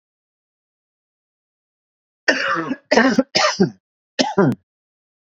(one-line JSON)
{"three_cough_length": "5.3 s", "three_cough_amplitude": 28002, "three_cough_signal_mean_std_ratio": 0.39, "survey_phase": "beta (2021-08-13 to 2022-03-07)", "age": "45-64", "gender": "Male", "wearing_mask": "No", "symptom_none": true, "smoker_status": "Never smoked", "respiratory_condition_asthma": false, "respiratory_condition_other": false, "recruitment_source": "REACT", "submission_delay": "2 days", "covid_test_result": "Negative", "covid_test_method": "RT-qPCR", "influenza_a_test_result": "Negative", "influenza_b_test_result": "Negative"}